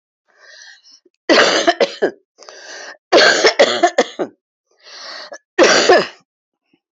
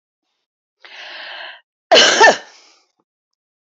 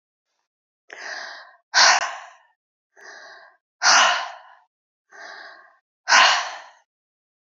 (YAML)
cough_length: 6.9 s
cough_amplitude: 32767
cough_signal_mean_std_ratio: 0.44
three_cough_length: 3.7 s
three_cough_amplitude: 29901
three_cough_signal_mean_std_ratio: 0.31
exhalation_length: 7.6 s
exhalation_amplitude: 28439
exhalation_signal_mean_std_ratio: 0.34
survey_phase: beta (2021-08-13 to 2022-03-07)
age: 65+
gender: Female
wearing_mask: 'No'
symptom_cough_any: true
symptom_runny_or_blocked_nose: true
symptom_sore_throat: true
symptom_abdominal_pain: true
symptom_diarrhoea: true
symptom_fatigue: true
symptom_headache: true
symptom_other: true
symptom_onset: 7 days
smoker_status: Ex-smoker
respiratory_condition_asthma: false
respiratory_condition_other: false
recruitment_source: Test and Trace
submission_delay: 1 day
covid_test_result: Positive
covid_test_method: RT-qPCR
covid_ct_value: 20.0
covid_ct_gene: ORF1ab gene
covid_ct_mean: 20.5
covid_viral_load: 180000 copies/ml
covid_viral_load_category: Low viral load (10K-1M copies/ml)